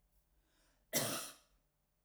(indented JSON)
{
  "cough_length": "2.0 s",
  "cough_amplitude": 3071,
  "cough_signal_mean_std_ratio": 0.34,
  "survey_phase": "alpha (2021-03-01 to 2021-08-12)",
  "age": "45-64",
  "gender": "Female",
  "wearing_mask": "No",
  "symptom_none": true,
  "symptom_onset": "9 days",
  "smoker_status": "Ex-smoker",
  "respiratory_condition_asthma": false,
  "respiratory_condition_other": false,
  "recruitment_source": "REACT",
  "submission_delay": "2 days",
  "covid_test_result": "Negative",
  "covid_test_method": "RT-qPCR"
}